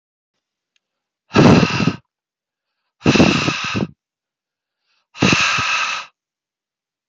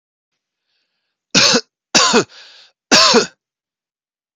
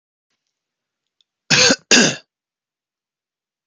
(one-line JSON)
{"exhalation_length": "7.1 s", "exhalation_amplitude": 29097, "exhalation_signal_mean_std_ratio": 0.41, "three_cough_length": "4.4 s", "three_cough_amplitude": 32768, "three_cough_signal_mean_std_ratio": 0.37, "cough_length": "3.7 s", "cough_amplitude": 30880, "cough_signal_mean_std_ratio": 0.28, "survey_phase": "beta (2021-08-13 to 2022-03-07)", "age": "18-44", "gender": "Male", "wearing_mask": "No", "symptom_none": true, "smoker_status": "Never smoked", "respiratory_condition_asthma": false, "respiratory_condition_other": false, "recruitment_source": "REACT", "submission_delay": "3 days", "covid_test_result": "Negative", "covid_test_method": "RT-qPCR", "influenza_a_test_result": "Negative", "influenza_b_test_result": "Negative"}